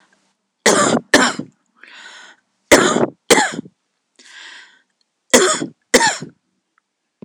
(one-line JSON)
{"three_cough_length": "7.2 s", "three_cough_amplitude": 26028, "three_cough_signal_mean_std_ratio": 0.38, "survey_phase": "beta (2021-08-13 to 2022-03-07)", "age": "45-64", "gender": "Female", "wearing_mask": "No", "symptom_none": true, "smoker_status": "Ex-smoker", "respiratory_condition_asthma": false, "respiratory_condition_other": false, "recruitment_source": "REACT", "submission_delay": "11 days", "covid_test_result": "Negative", "covid_test_method": "RT-qPCR", "influenza_a_test_result": "Unknown/Void", "influenza_b_test_result": "Unknown/Void"}